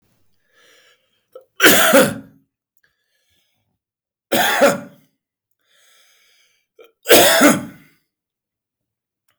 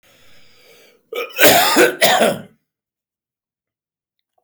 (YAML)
three_cough_length: 9.4 s
three_cough_amplitude: 32768
three_cough_signal_mean_std_ratio: 0.33
cough_length: 4.4 s
cough_amplitude: 32768
cough_signal_mean_std_ratio: 0.4
survey_phase: beta (2021-08-13 to 2022-03-07)
age: 45-64
gender: Male
wearing_mask: 'No'
symptom_runny_or_blocked_nose: true
symptom_fatigue: true
symptom_change_to_sense_of_smell_or_taste: true
symptom_onset: 3 days
smoker_status: Never smoked
respiratory_condition_asthma: false
respiratory_condition_other: false
recruitment_source: Test and Trace
submission_delay: 2 days
covid_test_result: Positive
covid_test_method: RT-qPCR
covid_ct_value: 14.9
covid_ct_gene: ORF1ab gene
covid_ct_mean: 15.1
covid_viral_load: 11000000 copies/ml
covid_viral_load_category: High viral load (>1M copies/ml)